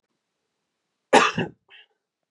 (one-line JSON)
{"cough_length": "2.3 s", "cough_amplitude": 29618, "cough_signal_mean_std_ratio": 0.25, "survey_phase": "beta (2021-08-13 to 2022-03-07)", "age": "18-44", "gender": "Male", "wearing_mask": "No", "symptom_cough_any": true, "symptom_runny_or_blocked_nose": true, "symptom_sore_throat": true, "symptom_onset": "5 days", "smoker_status": "Never smoked", "respiratory_condition_asthma": false, "respiratory_condition_other": false, "recruitment_source": "REACT", "submission_delay": "1 day", "covid_test_result": "Negative", "covid_test_method": "RT-qPCR", "influenza_a_test_result": "Negative", "influenza_b_test_result": "Negative"}